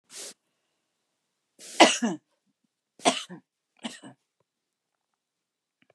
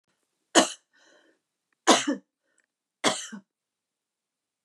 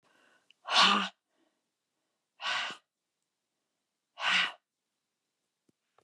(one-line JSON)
{"cough_length": "5.9 s", "cough_amplitude": 25228, "cough_signal_mean_std_ratio": 0.2, "three_cough_length": "4.6 s", "three_cough_amplitude": 25409, "three_cough_signal_mean_std_ratio": 0.24, "exhalation_length": "6.0 s", "exhalation_amplitude": 11109, "exhalation_signal_mean_std_ratio": 0.3, "survey_phase": "beta (2021-08-13 to 2022-03-07)", "age": "65+", "gender": "Female", "wearing_mask": "No", "symptom_fatigue": true, "symptom_headache": true, "smoker_status": "Ex-smoker", "respiratory_condition_asthma": false, "respiratory_condition_other": false, "recruitment_source": "REACT", "submission_delay": "6 days", "covid_test_result": "Negative", "covid_test_method": "RT-qPCR", "influenza_a_test_result": "Negative", "influenza_b_test_result": "Negative"}